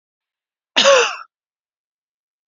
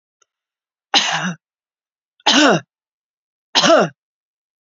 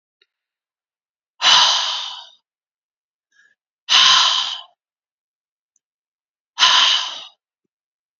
{"cough_length": "2.5 s", "cough_amplitude": 31052, "cough_signal_mean_std_ratio": 0.3, "three_cough_length": "4.6 s", "three_cough_amplitude": 32768, "three_cough_signal_mean_std_ratio": 0.37, "exhalation_length": "8.2 s", "exhalation_amplitude": 32620, "exhalation_signal_mean_std_ratio": 0.37, "survey_phase": "beta (2021-08-13 to 2022-03-07)", "age": "45-64", "gender": "Female", "wearing_mask": "No", "symptom_none": true, "smoker_status": "Never smoked", "respiratory_condition_asthma": false, "respiratory_condition_other": false, "recruitment_source": "REACT", "submission_delay": "2 days", "covid_test_result": "Negative", "covid_test_method": "RT-qPCR", "influenza_a_test_result": "Unknown/Void", "influenza_b_test_result": "Unknown/Void"}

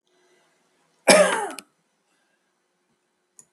{"cough_length": "3.5 s", "cough_amplitude": 32768, "cough_signal_mean_std_ratio": 0.25, "survey_phase": "beta (2021-08-13 to 2022-03-07)", "age": "65+", "gender": "Male", "wearing_mask": "No", "symptom_runny_or_blocked_nose": true, "smoker_status": "Ex-smoker", "respiratory_condition_asthma": false, "respiratory_condition_other": false, "recruitment_source": "REACT", "submission_delay": "2 days", "covid_test_result": "Negative", "covid_test_method": "RT-qPCR", "influenza_a_test_result": "Negative", "influenza_b_test_result": "Negative"}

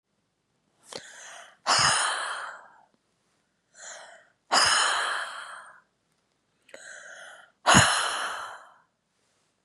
{"exhalation_length": "9.6 s", "exhalation_amplitude": 25031, "exhalation_signal_mean_std_ratio": 0.4, "survey_phase": "beta (2021-08-13 to 2022-03-07)", "age": "45-64", "gender": "Female", "wearing_mask": "No", "symptom_cough_any": true, "symptom_sore_throat": true, "symptom_onset": "4 days", "smoker_status": "Never smoked", "respiratory_condition_asthma": true, "respiratory_condition_other": false, "recruitment_source": "Test and Trace", "submission_delay": "1 day", "covid_test_result": "Positive", "covid_test_method": "RT-qPCR", "covid_ct_value": 26.8, "covid_ct_gene": "ORF1ab gene", "covid_ct_mean": 27.9, "covid_viral_load": "720 copies/ml", "covid_viral_load_category": "Minimal viral load (< 10K copies/ml)"}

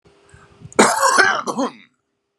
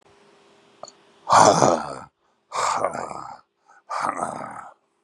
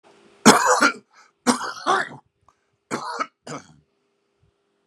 {"cough_length": "2.4 s", "cough_amplitude": 32768, "cough_signal_mean_std_ratio": 0.47, "exhalation_length": "5.0 s", "exhalation_amplitude": 32305, "exhalation_signal_mean_std_ratio": 0.39, "three_cough_length": "4.9 s", "three_cough_amplitude": 32768, "three_cough_signal_mean_std_ratio": 0.34, "survey_phase": "beta (2021-08-13 to 2022-03-07)", "age": "45-64", "gender": "Male", "wearing_mask": "No", "symptom_none": true, "smoker_status": "Ex-smoker", "respiratory_condition_asthma": false, "respiratory_condition_other": false, "recruitment_source": "REACT", "submission_delay": "-1 day", "covid_test_result": "Negative", "covid_test_method": "RT-qPCR", "influenza_a_test_result": "Negative", "influenza_b_test_result": "Negative"}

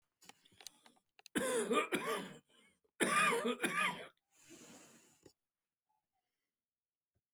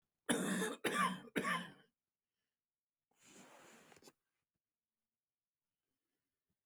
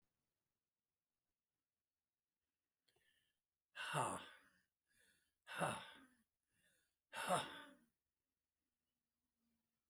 {"three_cough_length": "7.3 s", "three_cough_amplitude": 3427, "three_cough_signal_mean_std_ratio": 0.41, "cough_length": "6.7 s", "cough_amplitude": 3042, "cough_signal_mean_std_ratio": 0.34, "exhalation_length": "9.9 s", "exhalation_amplitude": 1846, "exhalation_signal_mean_std_ratio": 0.27, "survey_phase": "alpha (2021-03-01 to 2021-08-12)", "age": "65+", "gender": "Male", "wearing_mask": "No", "symptom_cough_any": true, "symptom_shortness_of_breath": true, "symptom_onset": "12 days", "smoker_status": "Never smoked", "respiratory_condition_asthma": true, "respiratory_condition_other": false, "recruitment_source": "REACT", "submission_delay": "2 days", "covid_test_result": "Negative", "covid_test_method": "RT-qPCR"}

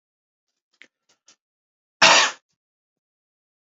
{"cough_length": "3.7 s", "cough_amplitude": 29403, "cough_signal_mean_std_ratio": 0.21, "survey_phase": "beta (2021-08-13 to 2022-03-07)", "age": "45-64", "gender": "Male", "wearing_mask": "No", "symptom_none": true, "smoker_status": "Never smoked", "respiratory_condition_asthma": false, "respiratory_condition_other": false, "recruitment_source": "Test and Trace", "submission_delay": "0 days", "covid_test_result": "Negative", "covid_test_method": "LFT"}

